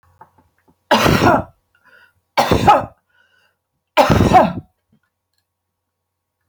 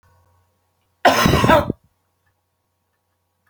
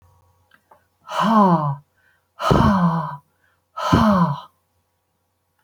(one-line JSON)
{"three_cough_length": "6.5 s", "three_cough_amplitude": 31831, "three_cough_signal_mean_std_ratio": 0.38, "cough_length": "3.5 s", "cough_amplitude": 28910, "cough_signal_mean_std_ratio": 0.33, "exhalation_length": "5.6 s", "exhalation_amplitude": 30128, "exhalation_signal_mean_std_ratio": 0.5, "survey_phase": "beta (2021-08-13 to 2022-03-07)", "age": "65+", "gender": "Female", "wearing_mask": "No", "symptom_shortness_of_breath": true, "symptom_abdominal_pain": true, "symptom_fatigue": true, "symptom_onset": "12 days", "smoker_status": "Ex-smoker", "respiratory_condition_asthma": false, "respiratory_condition_other": false, "recruitment_source": "REACT", "submission_delay": "2 days", "covid_test_result": "Negative", "covid_test_method": "RT-qPCR"}